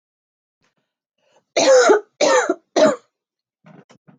{"three_cough_length": "4.2 s", "three_cough_amplitude": 25266, "three_cough_signal_mean_std_ratio": 0.4, "survey_phase": "beta (2021-08-13 to 2022-03-07)", "age": "18-44", "gender": "Female", "wearing_mask": "No", "symptom_runny_or_blocked_nose": true, "symptom_sore_throat": true, "symptom_onset": "6 days", "smoker_status": "Ex-smoker", "respiratory_condition_asthma": false, "respiratory_condition_other": false, "recruitment_source": "REACT", "submission_delay": "1 day", "covid_test_result": "Positive", "covid_test_method": "RT-qPCR", "covid_ct_value": 22.8, "covid_ct_gene": "E gene", "influenza_a_test_result": "Negative", "influenza_b_test_result": "Negative"}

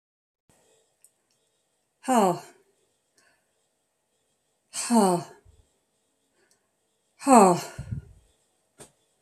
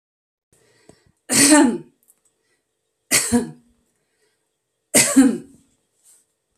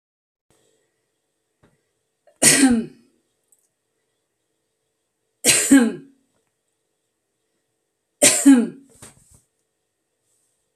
{"exhalation_length": "9.2 s", "exhalation_amplitude": 27099, "exhalation_signal_mean_std_ratio": 0.26, "cough_length": "6.6 s", "cough_amplitude": 32767, "cough_signal_mean_std_ratio": 0.33, "three_cough_length": "10.8 s", "three_cough_amplitude": 32768, "three_cough_signal_mean_std_ratio": 0.27, "survey_phase": "beta (2021-08-13 to 2022-03-07)", "age": "45-64", "gender": "Female", "wearing_mask": "No", "symptom_none": true, "smoker_status": "Ex-smoker", "respiratory_condition_asthma": false, "respiratory_condition_other": false, "recruitment_source": "REACT", "submission_delay": "2 days", "covid_test_result": "Negative", "covid_test_method": "RT-qPCR"}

